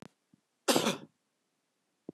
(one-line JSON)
{"cough_length": "2.1 s", "cough_amplitude": 9240, "cough_signal_mean_std_ratio": 0.28, "survey_phase": "beta (2021-08-13 to 2022-03-07)", "age": "65+", "gender": "Male", "wearing_mask": "No", "symptom_fatigue": true, "smoker_status": "Never smoked", "respiratory_condition_asthma": false, "respiratory_condition_other": false, "recruitment_source": "REACT", "submission_delay": "1 day", "covid_test_result": "Negative", "covid_test_method": "RT-qPCR", "influenza_a_test_result": "Negative", "influenza_b_test_result": "Negative"}